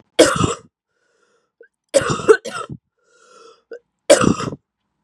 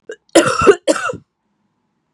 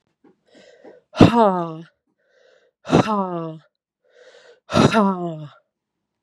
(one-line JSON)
{"three_cough_length": "5.0 s", "three_cough_amplitude": 32768, "three_cough_signal_mean_std_ratio": 0.33, "cough_length": "2.1 s", "cough_amplitude": 32768, "cough_signal_mean_std_ratio": 0.39, "exhalation_length": "6.2 s", "exhalation_amplitude": 32768, "exhalation_signal_mean_std_ratio": 0.36, "survey_phase": "beta (2021-08-13 to 2022-03-07)", "age": "18-44", "gender": "Female", "wearing_mask": "No", "symptom_cough_any": true, "symptom_runny_or_blocked_nose": true, "symptom_diarrhoea": true, "symptom_fatigue": true, "symptom_change_to_sense_of_smell_or_taste": true, "smoker_status": "Ex-smoker", "respiratory_condition_asthma": false, "respiratory_condition_other": false, "recruitment_source": "Test and Trace", "submission_delay": "2 days", "covid_test_result": "Positive", "covid_test_method": "RT-qPCR", "covid_ct_value": 14.2, "covid_ct_gene": "ORF1ab gene", "covid_ct_mean": 14.6, "covid_viral_load": "16000000 copies/ml", "covid_viral_load_category": "High viral load (>1M copies/ml)"}